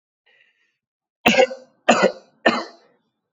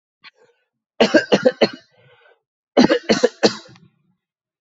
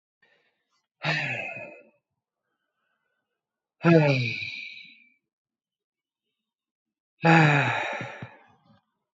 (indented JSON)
{
  "three_cough_length": "3.3 s",
  "three_cough_amplitude": 27737,
  "three_cough_signal_mean_std_ratio": 0.33,
  "cough_length": "4.6 s",
  "cough_amplitude": 32768,
  "cough_signal_mean_std_ratio": 0.33,
  "exhalation_length": "9.1 s",
  "exhalation_amplitude": 17929,
  "exhalation_signal_mean_std_ratio": 0.34,
  "survey_phase": "alpha (2021-03-01 to 2021-08-12)",
  "age": "18-44",
  "gender": "Male",
  "wearing_mask": "No",
  "symptom_fatigue": true,
  "symptom_headache": true,
  "symptom_onset": "2 days",
  "smoker_status": "Never smoked",
  "respiratory_condition_asthma": false,
  "respiratory_condition_other": false,
  "recruitment_source": "Test and Trace",
  "submission_delay": "1 day",
  "covid_test_result": "Positive",
  "covid_test_method": "RT-qPCR",
  "covid_ct_value": 17.9,
  "covid_ct_gene": "ORF1ab gene",
  "covid_ct_mean": 18.4,
  "covid_viral_load": "900000 copies/ml",
  "covid_viral_load_category": "Low viral load (10K-1M copies/ml)"
}